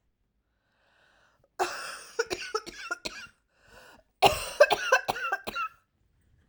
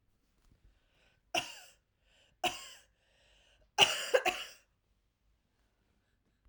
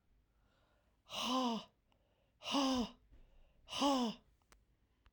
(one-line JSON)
{"cough_length": "6.5 s", "cough_amplitude": 18906, "cough_signal_mean_std_ratio": 0.34, "three_cough_length": "6.5 s", "three_cough_amplitude": 11972, "three_cough_signal_mean_std_ratio": 0.24, "exhalation_length": "5.1 s", "exhalation_amplitude": 2200, "exhalation_signal_mean_std_ratio": 0.45, "survey_phase": "alpha (2021-03-01 to 2021-08-12)", "age": "45-64", "gender": "Female", "wearing_mask": "No", "symptom_cough_any": true, "symptom_fatigue": true, "symptom_fever_high_temperature": true, "symptom_headache": true, "symptom_change_to_sense_of_smell_or_taste": true, "smoker_status": "Never smoked", "respiratory_condition_asthma": false, "respiratory_condition_other": false, "recruitment_source": "Test and Trace", "submission_delay": "2 days", "covid_test_result": "Positive", "covid_test_method": "RT-qPCR"}